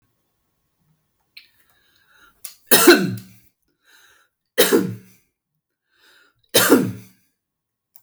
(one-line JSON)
{"three_cough_length": "8.0 s", "three_cough_amplitude": 32768, "three_cough_signal_mean_std_ratio": 0.28, "survey_phase": "beta (2021-08-13 to 2022-03-07)", "age": "65+", "gender": "Male", "wearing_mask": "No", "symptom_none": true, "smoker_status": "Never smoked", "respiratory_condition_asthma": false, "respiratory_condition_other": false, "recruitment_source": "REACT", "submission_delay": "1 day", "covid_test_result": "Negative", "covid_test_method": "RT-qPCR"}